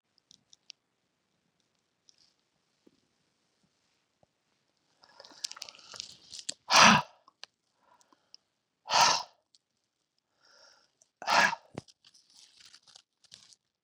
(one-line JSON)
{"exhalation_length": "13.8 s", "exhalation_amplitude": 15322, "exhalation_signal_mean_std_ratio": 0.2, "survey_phase": "beta (2021-08-13 to 2022-03-07)", "age": "45-64", "gender": "Female", "wearing_mask": "No", "symptom_cough_any": true, "symptom_runny_or_blocked_nose": true, "symptom_shortness_of_breath": true, "symptom_sore_throat": true, "symptom_fatigue": true, "symptom_fever_high_temperature": true, "symptom_headache": true, "symptom_change_to_sense_of_smell_or_taste": true, "symptom_onset": "5 days", "smoker_status": "Ex-smoker", "respiratory_condition_asthma": false, "respiratory_condition_other": false, "recruitment_source": "Test and Trace", "submission_delay": "2 days", "covid_test_result": "Positive", "covid_test_method": "RT-qPCR", "covid_ct_value": 21.7, "covid_ct_gene": "N gene", "covid_ct_mean": 22.2, "covid_viral_load": "51000 copies/ml", "covid_viral_load_category": "Low viral load (10K-1M copies/ml)"}